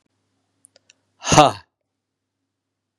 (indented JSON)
{
  "exhalation_length": "3.0 s",
  "exhalation_amplitude": 32768,
  "exhalation_signal_mean_std_ratio": 0.2,
  "survey_phase": "beta (2021-08-13 to 2022-03-07)",
  "age": "45-64",
  "gender": "Male",
  "wearing_mask": "No",
  "symptom_cough_any": true,
  "symptom_new_continuous_cough": true,
  "symptom_runny_or_blocked_nose": true,
  "symptom_sore_throat": true,
  "symptom_fatigue": true,
  "symptom_onset": "2 days",
  "smoker_status": "Never smoked",
  "respiratory_condition_asthma": false,
  "respiratory_condition_other": false,
  "recruitment_source": "Test and Trace",
  "submission_delay": "2 days",
  "covid_test_result": "Positive",
  "covid_test_method": "RT-qPCR",
  "covid_ct_value": 23.0,
  "covid_ct_gene": "N gene"
}